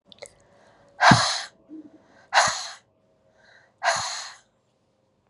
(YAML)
exhalation_length: 5.3 s
exhalation_amplitude: 29399
exhalation_signal_mean_std_ratio: 0.33
survey_phase: beta (2021-08-13 to 2022-03-07)
age: 45-64
gender: Female
wearing_mask: 'No'
symptom_cough_any: true
symptom_runny_or_blocked_nose: true
smoker_status: Never smoked
respiratory_condition_asthma: false
respiratory_condition_other: false
recruitment_source: Test and Trace
submission_delay: 2 days
covid_test_result: Positive
covid_test_method: LFT